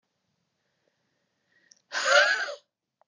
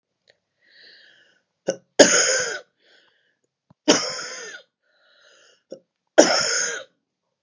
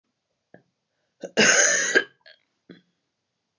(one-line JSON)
{"exhalation_length": "3.1 s", "exhalation_amplitude": 14542, "exhalation_signal_mean_std_ratio": 0.32, "three_cough_length": "7.4 s", "three_cough_amplitude": 32768, "three_cough_signal_mean_std_ratio": 0.31, "cough_length": "3.6 s", "cough_amplitude": 19690, "cough_signal_mean_std_ratio": 0.34, "survey_phase": "beta (2021-08-13 to 2022-03-07)", "age": "45-64", "gender": "Female", "wearing_mask": "No", "symptom_cough_any": true, "symptom_shortness_of_breath": true, "symptom_sore_throat": true, "symptom_diarrhoea": true, "symptom_fatigue": true, "symptom_headache": true, "symptom_change_to_sense_of_smell_or_taste": true, "symptom_onset": "3 days", "smoker_status": "Never smoked", "respiratory_condition_asthma": false, "respiratory_condition_other": false, "recruitment_source": "Test and Trace", "submission_delay": "1 day", "covid_test_result": "Positive", "covid_test_method": "RT-qPCR", "covid_ct_value": 20.7, "covid_ct_gene": "N gene"}